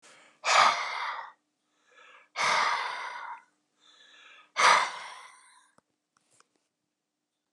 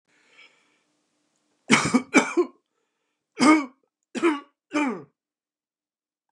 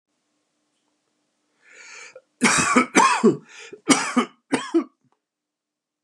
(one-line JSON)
{"exhalation_length": "7.5 s", "exhalation_amplitude": 13530, "exhalation_signal_mean_std_ratio": 0.38, "three_cough_length": "6.3 s", "three_cough_amplitude": 30163, "three_cough_signal_mean_std_ratio": 0.33, "cough_length": "6.0 s", "cough_amplitude": 28694, "cough_signal_mean_std_ratio": 0.37, "survey_phase": "beta (2021-08-13 to 2022-03-07)", "age": "65+", "gender": "Male", "wearing_mask": "No", "symptom_none": true, "smoker_status": "Never smoked", "respiratory_condition_asthma": false, "respiratory_condition_other": false, "recruitment_source": "REACT", "submission_delay": "1 day", "covid_test_result": "Negative", "covid_test_method": "RT-qPCR", "influenza_a_test_result": "Negative", "influenza_b_test_result": "Negative"}